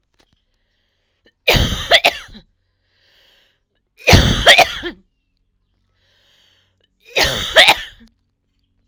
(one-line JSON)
{"three_cough_length": "8.9 s", "three_cough_amplitude": 32768, "three_cough_signal_mean_std_ratio": 0.33, "survey_phase": "alpha (2021-03-01 to 2021-08-12)", "age": "18-44", "gender": "Female", "wearing_mask": "No", "symptom_none": true, "smoker_status": "Ex-smoker", "respiratory_condition_asthma": true, "respiratory_condition_other": false, "recruitment_source": "REACT", "submission_delay": "1 day", "covid_test_result": "Negative", "covid_test_method": "RT-qPCR"}